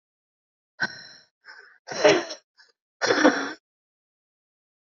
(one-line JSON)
{"exhalation_length": "4.9 s", "exhalation_amplitude": 25356, "exhalation_signal_mean_std_ratio": 0.31, "survey_phase": "beta (2021-08-13 to 2022-03-07)", "age": "18-44", "gender": "Female", "wearing_mask": "No", "symptom_cough_any": true, "symptom_sore_throat": true, "symptom_onset": "5 days", "smoker_status": "Current smoker (11 or more cigarettes per day)", "respiratory_condition_asthma": false, "respiratory_condition_other": false, "recruitment_source": "REACT", "submission_delay": "4 days", "covid_test_result": "Negative", "covid_test_method": "RT-qPCR", "influenza_a_test_result": "Negative", "influenza_b_test_result": "Negative"}